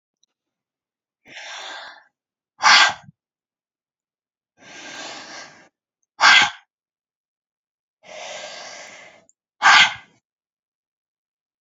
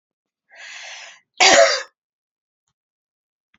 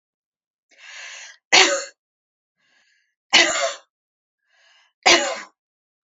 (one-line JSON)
{"exhalation_length": "11.6 s", "exhalation_amplitude": 29477, "exhalation_signal_mean_std_ratio": 0.25, "cough_length": "3.6 s", "cough_amplitude": 31437, "cough_signal_mean_std_ratio": 0.28, "three_cough_length": "6.1 s", "three_cough_amplitude": 32767, "three_cough_signal_mean_std_ratio": 0.3, "survey_phase": "alpha (2021-03-01 to 2021-08-12)", "age": "45-64", "gender": "Female", "wearing_mask": "No", "symptom_cough_any": true, "symptom_fatigue": true, "symptom_headache": true, "smoker_status": "Never smoked", "respiratory_condition_asthma": false, "respiratory_condition_other": false, "recruitment_source": "Test and Trace", "submission_delay": "2 days", "covid_test_result": "Positive", "covid_test_method": "RT-qPCR", "covid_ct_value": 19.2, "covid_ct_gene": "ORF1ab gene", "covid_ct_mean": 19.8, "covid_viral_load": "310000 copies/ml", "covid_viral_load_category": "Low viral load (10K-1M copies/ml)"}